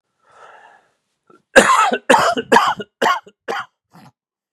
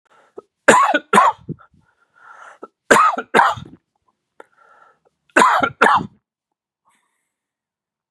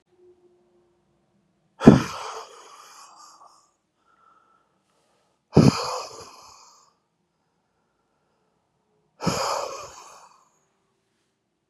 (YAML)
cough_length: 4.5 s
cough_amplitude: 32768
cough_signal_mean_std_ratio: 0.41
three_cough_length: 8.1 s
three_cough_amplitude: 32768
three_cough_signal_mean_std_ratio: 0.35
exhalation_length: 11.7 s
exhalation_amplitude: 32768
exhalation_signal_mean_std_ratio: 0.2
survey_phase: beta (2021-08-13 to 2022-03-07)
age: 45-64
gender: Male
wearing_mask: 'No'
symptom_none: true
smoker_status: Ex-smoker
respiratory_condition_asthma: false
respiratory_condition_other: false
recruitment_source: REACT
submission_delay: 1 day
covid_test_result: Negative
covid_test_method: RT-qPCR
influenza_a_test_result: Negative
influenza_b_test_result: Negative